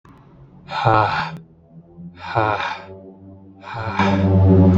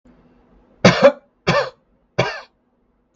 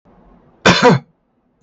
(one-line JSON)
{"exhalation_length": "4.8 s", "exhalation_amplitude": 32766, "exhalation_signal_mean_std_ratio": 0.56, "three_cough_length": "3.2 s", "three_cough_amplitude": 32768, "three_cough_signal_mean_std_ratio": 0.32, "cough_length": "1.6 s", "cough_amplitude": 32768, "cough_signal_mean_std_ratio": 0.38, "survey_phase": "beta (2021-08-13 to 2022-03-07)", "age": "18-44", "gender": "Male", "wearing_mask": "No", "symptom_none": true, "smoker_status": "Never smoked", "respiratory_condition_asthma": false, "respiratory_condition_other": false, "recruitment_source": "REACT", "submission_delay": "1 day", "covid_test_result": "Negative", "covid_test_method": "RT-qPCR"}